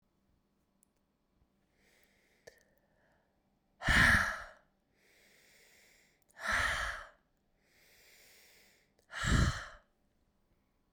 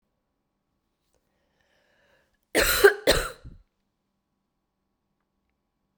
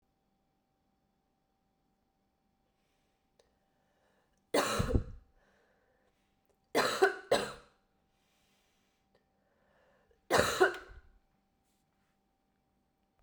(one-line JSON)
{"exhalation_length": "10.9 s", "exhalation_amplitude": 6572, "exhalation_signal_mean_std_ratio": 0.29, "cough_length": "6.0 s", "cough_amplitude": 26538, "cough_signal_mean_std_ratio": 0.23, "three_cough_length": "13.2 s", "three_cough_amplitude": 10220, "three_cough_signal_mean_std_ratio": 0.26, "survey_phase": "beta (2021-08-13 to 2022-03-07)", "age": "18-44", "gender": "Female", "wearing_mask": "No", "symptom_cough_any": true, "symptom_runny_or_blocked_nose": true, "symptom_headache": true, "symptom_other": true, "symptom_onset": "3 days", "smoker_status": "Never smoked", "respiratory_condition_asthma": false, "respiratory_condition_other": false, "recruitment_source": "Test and Trace", "submission_delay": "2 days", "covid_test_result": "Positive", "covid_test_method": "ePCR"}